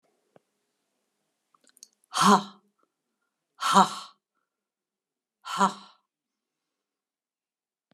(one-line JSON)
{"exhalation_length": "7.9 s", "exhalation_amplitude": 21159, "exhalation_signal_mean_std_ratio": 0.22, "survey_phase": "alpha (2021-03-01 to 2021-08-12)", "age": "65+", "gender": "Female", "wearing_mask": "No", "symptom_none": true, "smoker_status": "Prefer not to say", "respiratory_condition_asthma": false, "respiratory_condition_other": false, "recruitment_source": "REACT", "submission_delay": "1 day", "covid_test_result": "Negative", "covid_test_method": "RT-qPCR"}